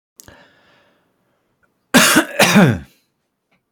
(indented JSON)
{
  "cough_length": "3.7 s",
  "cough_amplitude": 32767,
  "cough_signal_mean_std_ratio": 0.36,
  "survey_phase": "alpha (2021-03-01 to 2021-08-12)",
  "age": "18-44",
  "gender": "Male",
  "wearing_mask": "No",
  "symptom_fatigue": true,
  "symptom_onset": "12 days",
  "smoker_status": "Ex-smoker",
  "respiratory_condition_asthma": false,
  "respiratory_condition_other": false,
  "recruitment_source": "REACT",
  "submission_delay": "3 days",
  "covid_test_result": "Negative",
  "covid_test_method": "RT-qPCR"
}